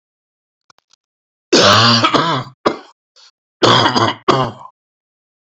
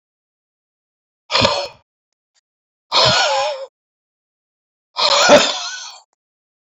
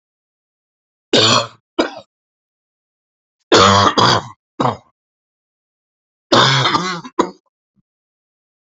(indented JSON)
{
  "cough_length": "5.5 s",
  "cough_amplitude": 32390,
  "cough_signal_mean_std_ratio": 0.46,
  "exhalation_length": "6.7 s",
  "exhalation_amplitude": 31523,
  "exhalation_signal_mean_std_ratio": 0.4,
  "three_cough_length": "8.7 s",
  "three_cough_amplitude": 31801,
  "three_cough_signal_mean_std_ratio": 0.38,
  "survey_phase": "beta (2021-08-13 to 2022-03-07)",
  "age": "45-64",
  "gender": "Male",
  "wearing_mask": "No",
  "symptom_cough_any": true,
  "smoker_status": "Current smoker (e-cigarettes or vapes only)",
  "respiratory_condition_asthma": false,
  "respiratory_condition_other": false,
  "recruitment_source": "REACT",
  "submission_delay": "1 day",
  "covid_test_result": "Negative",
  "covid_test_method": "RT-qPCR",
  "influenza_a_test_result": "Unknown/Void",
  "influenza_b_test_result": "Unknown/Void"
}